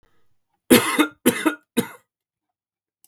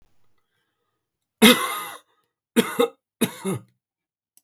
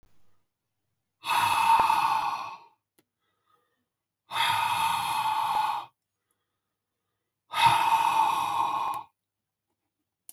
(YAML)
cough_length: 3.1 s
cough_amplitude: 32768
cough_signal_mean_std_ratio: 0.32
three_cough_length: 4.4 s
three_cough_amplitude: 32766
three_cough_signal_mean_std_ratio: 0.29
exhalation_length: 10.3 s
exhalation_amplitude: 11983
exhalation_signal_mean_std_ratio: 0.55
survey_phase: beta (2021-08-13 to 2022-03-07)
age: 45-64
gender: Male
wearing_mask: 'No'
symptom_none: true
smoker_status: Ex-smoker
respiratory_condition_asthma: false
respiratory_condition_other: false
recruitment_source: REACT
submission_delay: 2 days
covid_test_result: Negative
covid_test_method: RT-qPCR
influenza_a_test_result: Negative
influenza_b_test_result: Negative